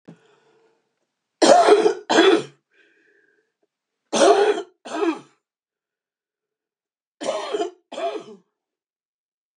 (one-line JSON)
{"three_cough_length": "9.6 s", "three_cough_amplitude": 28770, "three_cough_signal_mean_std_ratio": 0.36, "survey_phase": "beta (2021-08-13 to 2022-03-07)", "age": "65+", "gender": "Female", "wearing_mask": "No", "symptom_cough_any": true, "smoker_status": "Ex-smoker", "respiratory_condition_asthma": false, "respiratory_condition_other": true, "recruitment_source": "REACT", "submission_delay": "2 days", "covid_test_result": "Negative", "covid_test_method": "RT-qPCR", "influenza_a_test_result": "Negative", "influenza_b_test_result": "Negative"}